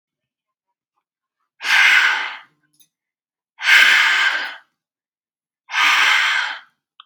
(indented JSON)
{
  "exhalation_length": "7.1 s",
  "exhalation_amplitude": 32767,
  "exhalation_signal_mean_std_ratio": 0.47,
  "survey_phase": "beta (2021-08-13 to 2022-03-07)",
  "age": "18-44",
  "gender": "Female",
  "wearing_mask": "No",
  "symptom_none": true,
  "smoker_status": "Never smoked",
  "respiratory_condition_asthma": false,
  "respiratory_condition_other": false,
  "recruitment_source": "REACT",
  "submission_delay": "2 days",
  "covid_test_result": "Negative",
  "covid_test_method": "RT-qPCR",
  "influenza_a_test_result": "Negative",
  "influenza_b_test_result": "Negative"
}